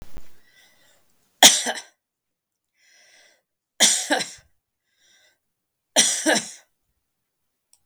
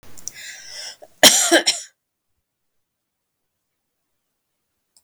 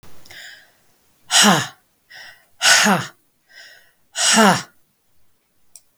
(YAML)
three_cough_length: 7.9 s
three_cough_amplitude: 32768
three_cough_signal_mean_std_ratio: 0.28
cough_length: 5.0 s
cough_amplitude: 32768
cough_signal_mean_std_ratio: 0.25
exhalation_length: 6.0 s
exhalation_amplitude: 32768
exhalation_signal_mean_std_ratio: 0.38
survey_phase: beta (2021-08-13 to 2022-03-07)
age: 65+
gender: Female
wearing_mask: 'No'
symptom_none: true
smoker_status: Ex-smoker
respiratory_condition_asthma: false
respiratory_condition_other: false
recruitment_source: REACT
submission_delay: 10 days
covid_test_result: Negative
covid_test_method: RT-qPCR
influenza_a_test_result: Unknown/Void
influenza_b_test_result: Unknown/Void